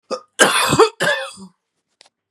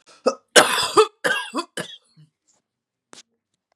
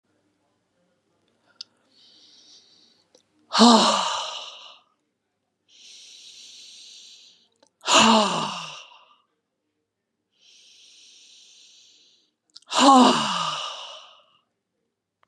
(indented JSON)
{
  "three_cough_length": "2.3 s",
  "three_cough_amplitude": 32767,
  "three_cough_signal_mean_std_ratio": 0.46,
  "cough_length": "3.8 s",
  "cough_amplitude": 32768,
  "cough_signal_mean_std_ratio": 0.32,
  "exhalation_length": "15.3 s",
  "exhalation_amplitude": 30841,
  "exhalation_signal_mean_std_ratio": 0.3,
  "survey_phase": "beta (2021-08-13 to 2022-03-07)",
  "age": "45-64",
  "gender": "Female",
  "wearing_mask": "No",
  "symptom_none": true,
  "smoker_status": "Current smoker (1 to 10 cigarettes per day)",
  "respiratory_condition_asthma": false,
  "respiratory_condition_other": false,
  "recruitment_source": "REACT",
  "submission_delay": "0 days",
  "covid_test_result": "Negative",
  "covid_test_method": "RT-qPCR",
  "influenza_a_test_result": "Negative",
  "influenza_b_test_result": "Negative"
}